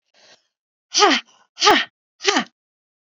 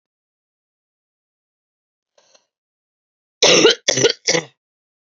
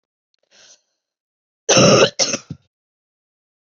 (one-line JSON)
{"exhalation_length": "3.2 s", "exhalation_amplitude": 30729, "exhalation_signal_mean_std_ratio": 0.35, "three_cough_length": "5.0 s", "three_cough_amplitude": 32768, "three_cough_signal_mean_std_ratio": 0.28, "cough_length": "3.8 s", "cough_amplitude": 31876, "cough_signal_mean_std_ratio": 0.31, "survey_phase": "beta (2021-08-13 to 2022-03-07)", "age": "18-44", "gender": "Female", "wearing_mask": "No", "symptom_cough_any": true, "symptom_runny_or_blocked_nose": true, "symptom_sore_throat": true, "symptom_headache": true, "symptom_onset": "3 days", "smoker_status": "Ex-smoker", "respiratory_condition_asthma": false, "respiratory_condition_other": false, "recruitment_source": "Test and Trace", "submission_delay": "2 days", "covid_test_result": "Positive", "covid_test_method": "ePCR"}